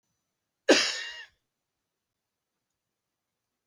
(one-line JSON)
{"cough_length": "3.7 s", "cough_amplitude": 14496, "cough_signal_mean_std_ratio": 0.21, "survey_phase": "beta (2021-08-13 to 2022-03-07)", "age": "65+", "gender": "Male", "wearing_mask": "No", "symptom_cough_any": true, "symptom_runny_or_blocked_nose": true, "smoker_status": "Never smoked", "respiratory_condition_asthma": false, "respiratory_condition_other": false, "recruitment_source": "REACT", "submission_delay": "1 day", "covid_test_result": "Negative", "covid_test_method": "RT-qPCR", "influenza_a_test_result": "Negative", "influenza_b_test_result": "Negative"}